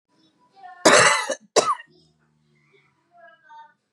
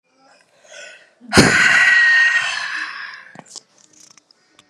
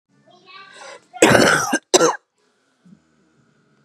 {"three_cough_length": "3.9 s", "three_cough_amplitude": 30673, "three_cough_signal_mean_std_ratio": 0.31, "exhalation_length": "4.7 s", "exhalation_amplitude": 32768, "exhalation_signal_mean_std_ratio": 0.5, "cough_length": "3.8 s", "cough_amplitude": 32768, "cough_signal_mean_std_ratio": 0.35, "survey_phase": "beta (2021-08-13 to 2022-03-07)", "age": "45-64", "gender": "Female", "wearing_mask": "No", "symptom_cough_any": true, "symptom_shortness_of_breath": true, "symptom_fatigue": true, "symptom_headache": true, "symptom_onset": "12 days", "smoker_status": "Current smoker (1 to 10 cigarettes per day)", "respiratory_condition_asthma": false, "respiratory_condition_other": false, "recruitment_source": "REACT", "submission_delay": "2 days", "covid_test_result": "Negative", "covid_test_method": "RT-qPCR", "influenza_a_test_result": "Negative", "influenza_b_test_result": "Negative"}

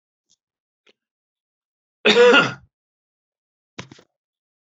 {"cough_length": "4.6 s", "cough_amplitude": 27894, "cough_signal_mean_std_ratio": 0.26, "survey_phase": "beta (2021-08-13 to 2022-03-07)", "age": "65+", "gender": "Male", "wearing_mask": "No", "symptom_none": true, "smoker_status": "Ex-smoker", "respiratory_condition_asthma": false, "respiratory_condition_other": false, "recruitment_source": "REACT", "submission_delay": "2 days", "covid_test_result": "Negative", "covid_test_method": "RT-qPCR"}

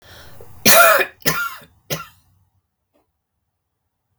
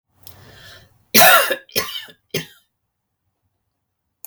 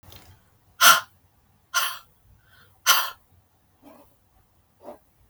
{"three_cough_length": "4.2 s", "three_cough_amplitude": 32768, "three_cough_signal_mean_std_ratio": 0.33, "cough_length": "4.3 s", "cough_amplitude": 32768, "cough_signal_mean_std_ratio": 0.29, "exhalation_length": "5.3 s", "exhalation_amplitude": 31083, "exhalation_signal_mean_std_ratio": 0.26, "survey_phase": "beta (2021-08-13 to 2022-03-07)", "age": "45-64", "gender": "Female", "wearing_mask": "No", "symptom_cough_any": true, "symptom_fatigue": true, "symptom_onset": "5 days", "smoker_status": "Never smoked", "respiratory_condition_asthma": false, "respiratory_condition_other": false, "recruitment_source": "REACT", "submission_delay": "1 day", "covid_test_result": "Negative", "covid_test_method": "RT-qPCR", "influenza_a_test_result": "Negative", "influenza_b_test_result": "Negative"}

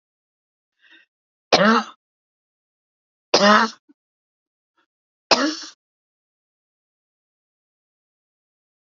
{"three_cough_length": "9.0 s", "three_cough_amplitude": 28631, "three_cough_signal_mean_std_ratio": 0.24, "survey_phase": "alpha (2021-03-01 to 2021-08-12)", "age": "65+", "gender": "Female", "wearing_mask": "No", "symptom_cough_any": true, "symptom_fatigue": true, "symptom_headache": true, "symptom_change_to_sense_of_smell_or_taste": true, "symptom_onset": "13 days", "smoker_status": "Never smoked", "respiratory_condition_asthma": false, "respiratory_condition_other": false, "recruitment_source": "REACT", "submission_delay": "1 day", "covid_test_result": "Negative", "covid_test_method": "RT-qPCR"}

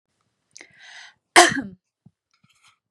{"cough_length": "2.9 s", "cough_amplitude": 32767, "cough_signal_mean_std_ratio": 0.21, "survey_phase": "beta (2021-08-13 to 2022-03-07)", "age": "18-44", "gender": "Female", "wearing_mask": "No", "symptom_none": true, "smoker_status": "Never smoked", "respiratory_condition_asthma": false, "respiratory_condition_other": false, "recruitment_source": "REACT", "submission_delay": "4 days", "covid_test_result": "Negative", "covid_test_method": "RT-qPCR", "influenza_a_test_result": "Negative", "influenza_b_test_result": "Negative"}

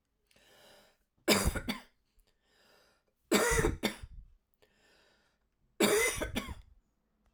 {"three_cough_length": "7.3 s", "three_cough_amplitude": 8760, "three_cough_signal_mean_std_ratio": 0.38, "survey_phase": "alpha (2021-03-01 to 2021-08-12)", "age": "45-64", "gender": "Female", "wearing_mask": "No", "symptom_cough_any": true, "symptom_fatigue": true, "symptom_fever_high_temperature": true, "symptom_onset": "3 days", "smoker_status": "Ex-smoker", "respiratory_condition_asthma": false, "respiratory_condition_other": false, "recruitment_source": "Test and Trace", "submission_delay": "1 day", "covid_test_result": "Positive", "covid_test_method": "RT-qPCR"}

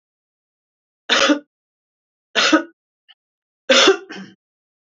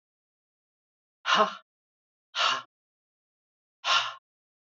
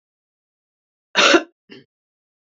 {"three_cough_length": "4.9 s", "three_cough_amplitude": 29927, "three_cough_signal_mean_std_ratio": 0.33, "exhalation_length": "4.8 s", "exhalation_amplitude": 13118, "exhalation_signal_mean_std_ratio": 0.3, "cough_length": "2.6 s", "cough_amplitude": 29720, "cough_signal_mean_std_ratio": 0.25, "survey_phase": "beta (2021-08-13 to 2022-03-07)", "age": "65+", "gender": "Female", "wearing_mask": "No", "symptom_runny_or_blocked_nose": true, "symptom_sore_throat": true, "symptom_onset": "12 days", "smoker_status": "Ex-smoker", "respiratory_condition_asthma": false, "respiratory_condition_other": false, "recruitment_source": "REACT", "submission_delay": "2 days", "covid_test_result": "Negative", "covid_test_method": "RT-qPCR", "influenza_a_test_result": "Negative", "influenza_b_test_result": "Negative"}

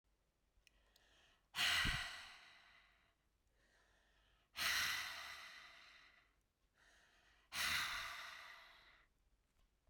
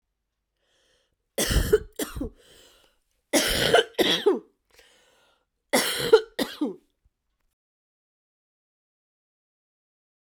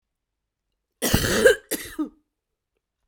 {"exhalation_length": "9.9 s", "exhalation_amplitude": 1602, "exhalation_signal_mean_std_ratio": 0.41, "three_cough_length": "10.2 s", "three_cough_amplitude": 19875, "three_cough_signal_mean_std_ratio": 0.33, "cough_length": "3.1 s", "cough_amplitude": 23299, "cough_signal_mean_std_ratio": 0.35, "survey_phase": "beta (2021-08-13 to 2022-03-07)", "age": "45-64", "gender": "Female", "wearing_mask": "No", "symptom_cough_any": true, "symptom_runny_or_blocked_nose": true, "symptom_shortness_of_breath": true, "symptom_abdominal_pain": true, "symptom_diarrhoea": true, "symptom_fatigue": true, "symptom_fever_high_temperature": true, "symptom_headache": true, "symptom_change_to_sense_of_smell_or_taste": true, "symptom_loss_of_taste": true, "symptom_onset": "8 days", "smoker_status": "Ex-smoker", "respiratory_condition_asthma": false, "respiratory_condition_other": false, "recruitment_source": "REACT", "submission_delay": "0 days", "covid_test_result": "Negative", "covid_test_method": "RT-qPCR"}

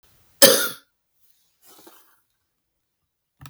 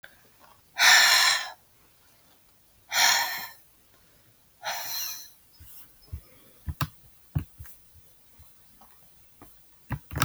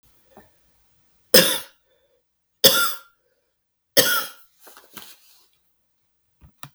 {"cough_length": "3.5 s", "cough_amplitude": 32768, "cough_signal_mean_std_ratio": 0.2, "exhalation_length": "10.2 s", "exhalation_amplitude": 23553, "exhalation_signal_mean_std_ratio": 0.35, "three_cough_length": "6.7 s", "three_cough_amplitude": 32768, "three_cough_signal_mean_std_ratio": 0.26, "survey_phase": "beta (2021-08-13 to 2022-03-07)", "age": "45-64", "gender": "Male", "wearing_mask": "No", "symptom_new_continuous_cough": true, "symptom_sore_throat": true, "symptom_fatigue": true, "symptom_fever_high_temperature": true, "symptom_headache": true, "symptom_onset": "1 day", "smoker_status": "Never smoked", "respiratory_condition_asthma": false, "respiratory_condition_other": false, "recruitment_source": "Test and Trace", "submission_delay": "1 day", "covid_test_result": "Positive", "covid_test_method": "RT-qPCR", "covid_ct_value": 21.2, "covid_ct_gene": "ORF1ab gene", "covid_ct_mean": 21.5, "covid_viral_load": "87000 copies/ml", "covid_viral_load_category": "Low viral load (10K-1M copies/ml)"}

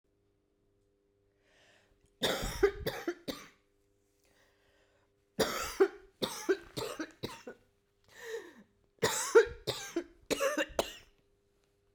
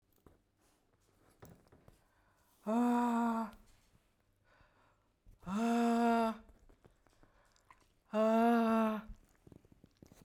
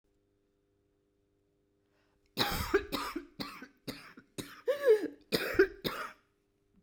{"three_cough_length": "11.9 s", "three_cough_amplitude": 8358, "three_cough_signal_mean_std_ratio": 0.35, "exhalation_length": "10.2 s", "exhalation_amplitude": 2832, "exhalation_signal_mean_std_ratio": 0.47, "cough_length": "6.8 s", "cough_amplitude": 7155, "cough_signal_mean_std_ratio": 0.36, "survey_phase": "beta (2021-08-13 to 2022-03-07)", "age": "45-64", "gender": "Female", "wearing_mask": "No", "symptom_cough_any": true, "symptom_runny_or_blocked_nose": true, "symptom_shortness_of_breath": true, "symptom_sore_throat": true, "symptom_abdominal_pain": true, "symptom_fatigue": true, "symptom_headache": true, "symptom_change_to_sense_of_smell_or_taste": true, "symptom_loss_of_taste": true, "symptom_other": true, "symptom_onset": "3 days", "smoker_status": "Never smoked", "respiratory_condition_asthma": false, "respiratory_condition_other": false, "recruitment_source": "Test and Trace", "submission_delay": "1 day", "covid_test_result": "Positive", "covid_test_method": "RT-qPCR", "covid_ct_value": 19.3, "covid_ct_gene": "ORF1ab gene"}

